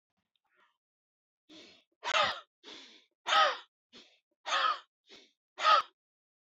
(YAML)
exhalation_length: 6.6 s
exhalation_amplitude: 6925
exhalation_signal_mean_std_ratio: 0.33
survey_phase: beta (2021-08-13 to 2022-03-07)
age: 45-64
gender: Male
wearing_mask: 'No'
symptom_none: true
smoker_status: Never smoked
respiratory_condition_asthma: false
respiratory_condition_other: false
recruitment_source: REACT
submission_delay: 1 day
covid_test_result: Negative
covid_test_method: RT-qPCR